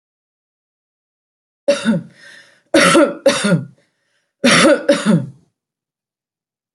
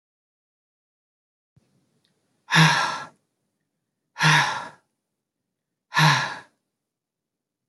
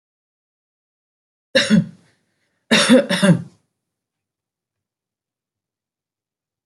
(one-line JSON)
{"three_cough_length": "6.7 s", "three_cough_amplitude": 31012, "three_cough_signal_mean_std_ratio": 0.42, "exhalation_length": "7.7 s", "exhalation_amplitude": 21429, "exhalation_signal_mean_std_ratio": 0.31, "cough_length": "6.7 s", "cough_amplitude": 27596, "cough_signal_mean_std_ratio": 0.29, "survey_phase": "beta (2021-08-13 to 2022-03-07)", "age": "45-64", "gender": "Female", "wearing_mask": "No", "symptom_none": true, "smoker_status": "Never smoked", "respiratory_condition_asthma": false, "respiratory_condition_other": false, "recruitment_source": "Test and Trace", "submission_delay": "-1 day", "covid_test_result": "Negative", "covid_test_method": "LFT"}